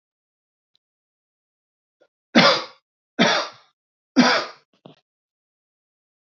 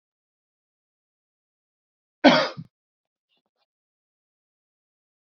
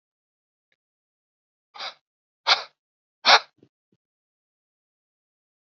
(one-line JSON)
{"three_cough_length": "6.2 s", "three_cough_amplitude": 27164, "three_cough_signal_mean_std_ratio": 0.28, "cough_length": "5.4 s", "cough_amplitude": 27325, "cough_signal_mean_std_ratio": 0.15, "exhalation_length": "5.6 s", "exhalation_amplitude": 25349, "exhalation_signal_mean_std_ratio": 0.17, "survey_phase": "beta (2021-08-13 to 2022-03-07)", "age": "18-44", "gender": "Male", "wearing_mask": "No", "symptom_runny_or_blocked_nose": true, "symptom_onset": "7 days", "smoker_status": "Never smoked", "respiratory_condition_asthma": false, "respiratory_condition_other": false, "recruitment_source": "REACT", "submission_delay": "1 day", "covid_test_result": "Negative", "covid_test_method": "RT-qPCR", "influenza_a_test_result": "Negative", "influenza_b_test_result": "Negative"}